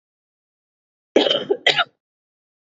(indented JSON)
{
  "cough_length": "2.6 s",
  "cough_amplitude": 28954,
  "cough_signal_mean_std_ratio": 0.32,
  "survey_phase": "beta (2021-08-13 to 2022-03-07)",
  "age": "45-64",
  "gender": "Female",
  "wearing_mask": "No",
  "symptom_cough_any": true,
  "symptom_runny_or_blocked_nose": true,
  "symptom_shortness_of_breath": true,
  "symptom_diarrhoea": true,
  "symptom_fatigue": true,
  "symptom_headache": true,
  "symptom_change_to_sense_of_smell_or_taste": true,
  "symptom_loss_of_taste": true,
  "symptom_onset": "3 days",
  "smoker_status": "Never smoked",
  "respiratory_condition_asthma": false,
  "respiratory_condition_other": false,
  "recruitment_source": "Test and Trace",
  "submission_delay": "2 days",
  "covid_test_result": "Positive",
  "covid_test_method": "RT-qPCR"
}